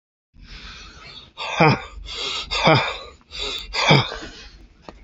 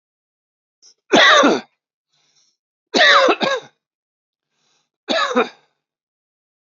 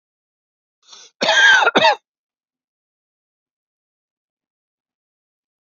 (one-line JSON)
{"exhalation_length": "5.0 s", "exhalation_amplitude": 32767, "exhalation_signal_mean_std_ratio": 0.47, "three_cough_length": "6.7 s", "three_cough_amplitude": 29018, "three_cough_signal_mean_std_ratio": 0.37, "cough_length": "5.6 s", "cough_amplitude": 28404, "cough_signal_mean_std_ratio": 0.28, "survey_phase": "beta (2021-08-13 to 2022-03-07)", "age": "45-64", "gender": "Male", "wearing_mask": "No", "symptom_shortness_of_breath": true, "symptom_fatigue": true, "smoker_status": "Ex-smoker", "respiratory_condition_asthma": false, "respiratory_condition_other": false, "recruitment_source": "REACT", "submission_delay": "2 days", "covid_test_result": "Negative", "covid_test_method": "RT-qPCR", "influenza_a_test_result": "Negative", "influenza_b_test_result": "Negative"}